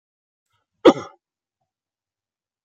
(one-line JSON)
{"cough_length": "2.6 s", "cough_amplitude": 32489, "cough_signal_mean_std_ratio": 0.14, "survey_phase": "beta (2021-08-13 to 2022-03-07)", "age": "65+", "gender": "Male", "wearing_mask": "No", "symptom_runny_or_blocked_nose": true, "symptom_sore_throat": true, "smoker_status": "Never smoked", "respiratory_condition_asthma": false, "respiratory_condition_other": false, "recruitment_source": "REACT", "submission_delay": "2 days", "covid_test_result": "Negative", "covid_test_method": "RT-qPCR"}